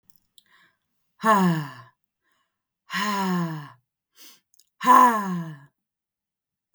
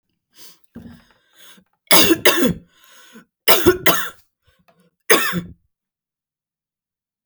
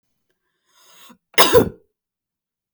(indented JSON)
{
  "exhalation_length": "6.7 s",
  "exhalation_amplitude": 23091,
  "exhalation_signal_mean_std_ratio": 0.38,
  "three_cough_length": "7.3 s",
  "three_cough_amplitude": 32768,
  "three_cough_signal_mean_std_ratio": 0.33,
  "cough_length": "2.7 s",
  "cough_amplitude": 32768,
  "cough_signal_mean_std_ratio": 0.25,
  "survey_phase": "beta (2021-08-13 to 2022-03-07)",
  "age": "18-44",
  "gender": "Female",
  "wearing_mask": "No",
  "symptom_cough_any": true,
  "symptom_runny_or_blocked_nose": true,
  "symptom_sore_throat": true,
  "symptom_onset": "4 days",
  "smoker_status": "Never smoked",
  "respiratory_condition_asthma": false,
  "respiratory_condition_other": false,
  "recruitment_source": "Test and Trace",
  "submission_delay": "1 day",
  "covid_test_result": "Positive",
  "covid_test_method": "ePCR"
}